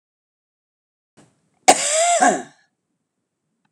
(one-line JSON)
{"cough_length": "3.7 s", "cough_amplitude": 32768, "cough_signal_mean_std_ratio": 0.33, "survey_phase": "alpha (2021-03-01 to 2021-08-12)", "age": "65+", "gender": "Female", "wearing_mask": "No", "symptom_none": true, "smoker_status": "Ex-smoker", "respiratory_condition_asthma": false, "respiratory_condition_other": false, "recruitment_source": "REACT", "submission_delay": "2 days", "covid_test_result": "Negative", "covid_test_method": "RT-qPCR"}